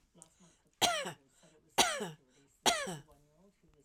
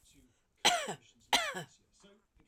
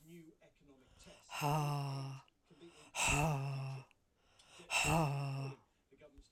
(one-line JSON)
{"three_cough_length": "3.8 s", "three_cough_amplitude": 8808, "three_cough_signal_mean_std_ratio": 0.36, "cough_length": "2.5 s", "cough_amplitude": 8617, "cough_signal_mean_std_ratio": 0.34, "exhalation_length": "6.3 s", "exhalation_amplitude": 3018, "exhalation_signal_mean_std_ratio": 0.6, "survey_phase": "alpha (2021-03-01 to 2021-08-12)", "age": "45-64", "gender": "Female", "wearing_mask": "No", "symptom_none": true, "smoker_status": "Never smoked", "respiratory_condition_asthma": false, "respiratory_condition_other": false, "recruitment_source": "REACT", "submission_delay": "2 days", "covid_test_result": "Negative", "covid_test_method": "RT-qPCR"}